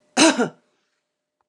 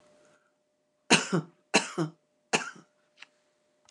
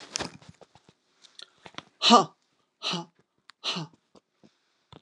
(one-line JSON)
{"cough_length": "1.5 s", "cough_amplitude": 28282, "cough_signal_mean_std_ratio": 0.33, "three_cough_length": "3.9 s", "three_cough_amplitude": 19551, "three_cough_signal_mean_std_ratio": 0.28, "exhalation_length": "5.0 s", "exhalation_amplitude": 27639, "exhalation_signal_mean_std_ratio": 0.23, "survey_phase": "beta (2021-08-13 to 2022-03-07)", "age": "65+", "gender": "Female", "wearing_mask": "No", "symptom_none": true, "smoker_status": "Never smoked", "respiratory_condition_asthma": false, "respiratory_condition_other": false, "recruitment_source": "REACT", "submission_delay": "2 days", "covid_test_result": "Negative", "covid_test_method": "RT-qPCR", "influenza_a_test_result": "Negative", "influenza_b_test_result": "Negative"}